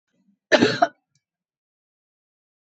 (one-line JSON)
{"cough_length": "2.6 s", "cough_amplitude": 24616, "cough_signal_mean_std_ratio": 0.24, "survey_phase": "beta (2021-08-13 to 2022-03-07)", "age": "65+", "gender": "Female", "wearing_mask": "No", "symptom_none": true, "smoker_status": "Never smoked", "respiratory_condition_asthma": false, "respiratory_condition_other": false, "recruitment_source": "REACT", "submission_delay": "6 days", "covid_test_result": "Negative", "covid_test_method": "RT-qPCR"}